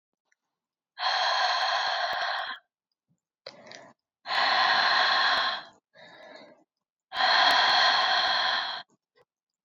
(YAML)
exhalation_length: 9.6 s
exhalation_amplitude: 11215
exhalation_signal_mean_std_ratio: 0.62
survey_phase: alpha (2021-03-01 to 2021-08-12)
age: 18-44
gender: Female
wearing_mask: 'No'
symptom_cough_any: true
symptom_headache: true
symptom_change_to_sense_of_smell_or_taste: true
symptom_onset: 4 days
smoker_status: Ex-smoker
respiratory_condition_asthma: false
respiratory_condition_other: false
recruitment_source: Test and Trace
submission_delay: 2 days
covid_test_result: Positive
covid_test_method: RT-qPCR
covid_ct_value: 17.6
covid_ct_gene: ORF1ab gene